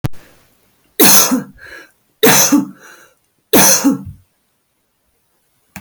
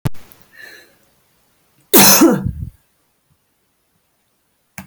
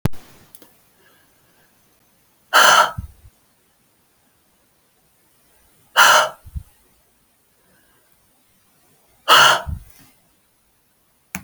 three_cough_length: 5.8 s
three_cough_amplitude: 32768
three_cough_signal_mean_std_ratio: 0.42
cough_length: 4.9 s
cough_amplitude: 32768
cough_signal_mean_std_ratio: 0.31
exhalation_length: 11.4 s
exhalation_amplitude: 32768
exhalation_signal_mean_std_ratio: 0.27
survey_phase: beta (2021-08-13 to 2022-03-07)
age: 45-64
gender: Female
wearing_mask: 'No'
symptom_none: true
smoker_status: Never smoked
respiratory_condition_asthma: false
respiratory_condition_other: false
recruitment_source: REACT
submission_delay: 1 day
covid_test_result: Negative
covid_test_method: RT-qPCR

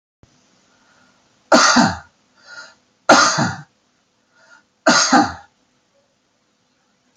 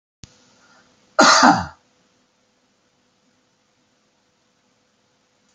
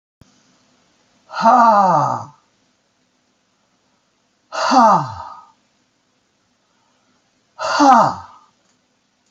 three_cough_length: 7.2 s
three_cough_amplitude: 32476
three_cough_signal_mean_std_ratio: 0.34
cough_length: 5.5 s
cough_amplitude: 29377
cough_signal_mean_std_ratio: 0.23
exhalation_length: 9.3 s
exhalation_amplitude: 28633
exhalation_signal_mean_std_ratio: 0.37
survey_phase: alpha (2021-03-01 to 2021-08-12)
age: 65+
gender: Male
wearing_mask: 'No'
symptom_headache: true
smoker_status: Ex-smoker
respiratory_condition_asthma: false
respiratory_condition_other: false
recruitment_source: REACT
submission_delay: 1 day
covid_test_result: Negative
covid_test_method: RT-qPCR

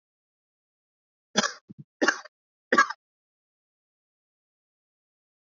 three_cough_length: 5.5 s
three_cough_amplitude: 16452
three_cough_signal_mean_std_ratio: 0.19
survey_phase: beta (2021-08-13 to 2022-03-07)
age: 18-44
gender: Male
wearing_mask: 'No'
symptom_cough_any: true
symptom_other: true
smoker_status: Never smoked
respiratory_condition_asthma: true
respiratory_condition_other: false
recruitment_source: Test and Trace
submission_delay: -1 day
covid_test_result: Negative
covid_test_method: LFT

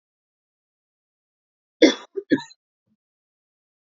cough_length: 3.9 s
cough_amplitude: 31581
cough_signal_mean_std_ratio: 0.17
survey_phase: beta (2021-08-13 to 2022-03-07)
age: 18-44
gender: Female
wearing_mask: 'No'
symptom_none: true
smoker_status: Never smoked
respiratory_condition_asthma: false
respiratory_condition_other: false
recruitment_source: REACT
submission_delay: 3 days
covid_test_result: Negative
covid_test_method: RT-qPCR
influenza_a_test_result: Negative
influenza_b_test_result: Negative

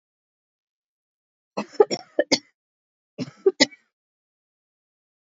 cough_length: 5.3 s
cough_amplitude: 26880
cough_signal_mean_std_ratio: 0.19
survey_phase: beta (2021-08-13 to 2022-03-07)
age: 45-64
gender: Female
wearing_mask: 'No'
symptom_cough_any: true
symptom_onset: 5 days
smoker_status: Ex-smoker
respiratory_condition_asthma: false
respiratory_condition_other: false
recruitment_source: Test and Trace
submission_delay: 2 days
covid_test_result: Positive
covid_test_method: RT-qPCR
covid_ct_value: 24.6
covid_ct_gene: ORF1ab gene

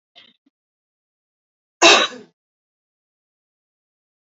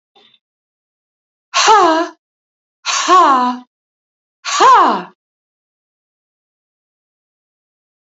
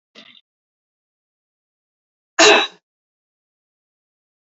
cough_length: 4.3 s
cough_amplitude: 30899
cough_signal_mean_std_ratio: 0.19
exhalation_length: 8.0 s
exhalation_amplitude: 28798
exhalation_signal_mean_std_ratio: 0.38
three_cough_length: 4.5 s
three_cough_amplitude: 30347
three_cough_signal_mean_std_ratio: 0.2
survey_phase: beta (2021-08-13 to 2022-03-07)
age: 45-64
gender: Female
wearing_mask: 'No'
symptom_runny_or_blocked_nose: true
symptom_abdominal_pain: true
symptom_fatigue: true
symptom_headache: true
symptom_onset: 5 days
smoker_status: Ex-smoker
respiratory_condition_asthma: false
respiratory_condition_other: false
recruitment_source: REACT
submission_delay: 1 day
covid_test_result: Negative
covid_test_method: RT-qPCR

